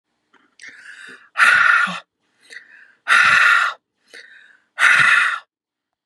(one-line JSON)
{"exhalation_length": "6.1 s", "exhalation_amplitude": 30763, "exhalation_signal_mean_std_ratio": 0.47, "survey_phase": "beta (2021-08-13 to 2022-03-07)", "age": "45-64", "gender": "Female", "wearing_mask": "No", "symptom_none": true, "smoker_status": "Ex-smoker", "respiratory_condition_asthma": false, "respiratory_condition_other": false, "recruitment_source": "REACT", "submission_delay": "2 days", "covid_test_result": "Negative", "covid_test_method": "RT-qPCR", "influenza_a_test_result": "Negative", "influenza_b_test_result": "Negative"}